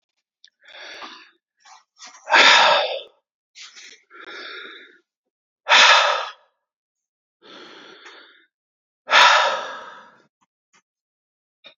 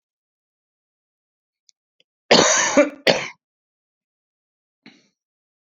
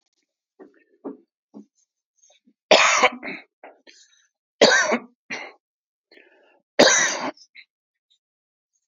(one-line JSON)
{"exhalation_length": "11.8 s", "exhalation_amplitude": 31561, "exhalation_signal_mean_std_ratio": 0.32, "cough_length": "5.7 s", "cough_amplitude": 30472, "cough_signal_mean_std_ratio": 0.27, "three_cough_length": "8.9 s", "three_cough_amplitude": 28493, "three_cough_signal_mean_std_ratio": 0.3, "survey_phase": "beta (2021-08-13 to 2022-03-07)", "age": "45-64", "gender": "Female", "wearing_mask": "No", "symptom_cough_any": true, "symptom_runny_or_blocked_nose": true, "symptom_shortness_of_breath": true, "symptom_sore_throat": true, "symptom_abdominal_pain": true, "symptom_fatigue": true, "symptom_headache": true, "symptom_change_to_sense_of_smell_or_taste": true, "smoker_status": "Ex-smoker", "respiratory_condition_asthma": false, "respiratory_condition_other": false, "recruitment_source": "Test and Trace", "submission_delay": "0 days", "covid_test_result": "Negative", "covid_test_method": "RT-qPCR"}